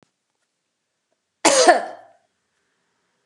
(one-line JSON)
{"cough_length": "3.3 s", "cough_amplitude": 32764, "cough_signal_mean_std_ratio": 0.27, "survey_phase": "beta (2021-08-13 to 2022-03-07)", "age": "45-64", "gender": "Female", "wearing_mask": "No", "symptom_none": true, "smoker_status": "Never smoked", "respiratory_condition_asthma": false, "respiratory_condition_other": false, "recruitment_source": "REACT", "submission_delay": "2 days", "covid_test_result": "Negative", "covid_test_method": "RT-qPCR"}